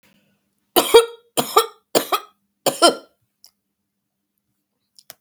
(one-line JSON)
{"three_cough_length": "5.2 s", "three_cough_amplitude": 32768, "three_cough_signal_mean_std_ratio": 0.27, "survey_phase": "beta (2021-08-13 to 2022-03-07)", "age": "65+", "gender": "Female", "wearing_mask": "No", "symptom_cough_any": true, "symptom_runny_or_blocked_nose": true, "smoker_status": "Never smoked", "respiratory_condition_asthma": false, "respiratory_condition_other": false, "recruitment_source": "REACT", "submission_delay": "1 day", "covid_test_result": "Negative", "covid_test_method": "RT-qPCR", "influenza_a_test_result": "Negative", "influenza_b_test_result": "Negative"}